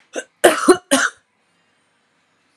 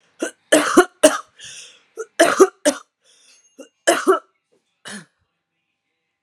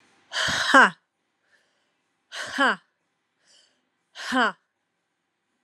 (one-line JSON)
{"cough_length": "2.6 s", "cough_amplitude": 32768, "cough_signal_mean_std_ratio": 0.32, "three_cough_length": "6.2 s", "three_cough_amplitude": 32768, "three_cough_signal_mean_std_ratio": 0.32, "exhalation_length": "5.6 s", "exhalation_amplitude": 28877, "exhalation_signal_mean_std_ratio": 0.3, "survey_phase": "alpha (2021-03-01 to 2021-08-12)", "age": "45-64", "gender": "Female", "wearing_mask": "No", "symptom_shortness_of_breath": true, "symptom_headache": true, "symptom_onset": "5 days", "smoker_status": "Ex-smoker", "respiratory_condition_asthma": true, "respiratory_condition_other": false, "recruitment_source": "Test and Trace", "submission_delay": "2 days", "covid_test_result": "Positive", "covid_test_method": "RT-qPCR", "covid_ct_value": 17.0, "covid_ct_gene": "ORF1ab gene"}